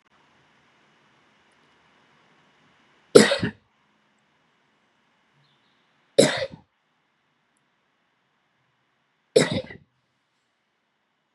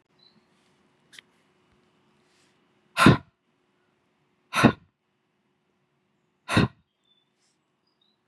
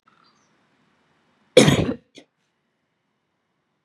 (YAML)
three_cough_length: 11.3 s
three_cough_amplitude: 32768
three_cough_signal_mean_std_ratio: 0.17
exhalation_length: 8.3 s
exhalation_amplitude: 27808
exhalation_signal_mean_std_ratio: 0.19
cough_length: 3.8 s
cough_amplitude: 32767
cough_signal_mean_std_ratio: 0.21
survey_phase: beta (2021-08-13 to 2022-03-07)
age: 45-64
gender: Female
wearing_mask: 'No'
symptom_none: true
symptom_onset: 3 days
smoker_status: Never smoked
respiratory_condition_asthma: false
respiratory_condition_other: false
recruitment_source: REACT
submission_delay: 2 days
covid_test_result: Negative
covid_test_method: RT-qPCR
influenza_a_test_result: Negative
influenza_b_test_result: Negative